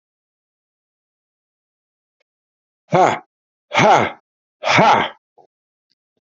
{"exhalation_length": "6.3 s", "exhalation_amplitude": 31424, "exhalation_signal_mean_std_ratio": 0.32, "survey_phase": "beta (2021-08-13 to 2022-03-07)", "age": "45-64", "gender": "Male", "wearing_mask": "No", "symptom_none": true, "smoker_status": "Current smoker (11 or more cigarettes per day)", "respiratory_condition_asthma": false, "respiratory_condition_other": false, "recruitment_source": "REACT", "submission_delay": "2 days", "covid_test_result": "Negative", "covid_test_method": "RT-qPCR"}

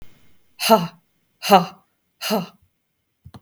{"exhalation_length": "3.4 s", "exhalation_amplitude": 32766, "exhalation_signal_mean_std_ratio": 0.31, "survey_phase": "beta (2021-08-13 to 2022-03-07)", "age": "45-64", "gender": "Female", "wearing_mask": "No", "symptom_none": true, "smoker_status": "Never smoked", "respiratory_condition_asthma": false, "respiratory_condition_other": false, "recruitment_source": "REACT", "submission_delay": "2 days", "covid_test_result": "Negative", "covid_test_method": "RT-qPCR"}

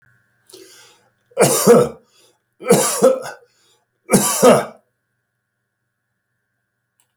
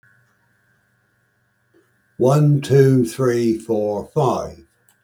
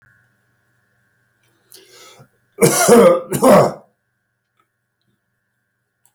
{"three_cough_length": "7.2 s", "three_cough_amplitude": 32768, "three_cough_signal_mean_std_ratio": 0.36, "exhalation_length": "5.0 s", "exhalation_amplitude": 27313, "exhalation_signal_mean_std_ratio": 0.53, "cough_length": "6.1 s", "cough_amplitude": 32767, "cough_signal_mean_std_ratio": 0.32, "survey_phase": "beta (2021-08-13 to 2022-03-07)", "age": "65+", "gender": "Male", "wearing_mask": "No", "symptom_none": true, "smoker_status": "Never smoked", "respiratory_condition_asthma": false, "respiratory_condition_other": false, "recruitment_source": "REACT", "submission_delay": "2 days", "covid_test_result": "Negative", "covid_test_method": "RT-qPCR"}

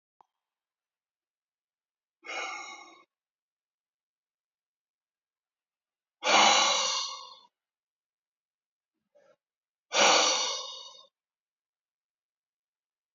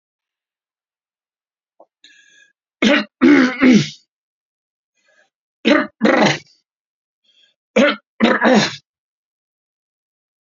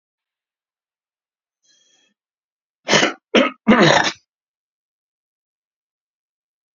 {"exhalation_length": "13.1 s", "exhalation_amplitude": 14974, "exhalation_signal_mean_std_ratio": 0.28, "three_cough_length": "10.4 s", "three_cough_amplitude": 32653, "three_cough_signal_mean_std_ratio": 0.35, "cough_length": "6.7 s", "cough_amplitude": 32767, "cough_signal_mean_std_ratio": 0.26, "survey_phase": "beta (2021-08-13 to 2022-03-07)", "age": "65+", "gender": "Male", "wearing_mask": "No", "symptom_none": true, "smoker_status": "Ex-smoker", "respiratory_condition_asthma": false, "respiratory_condition_other": false, "recruitment_source": "REACT", "submission_delay": "3 days", "covid_test_result": "Negative", "covid_test_method": "RT-qPCR", "influenza_a_test_result": "Unknown/Void", "influenza_b_test_result": "Unknown/Void"}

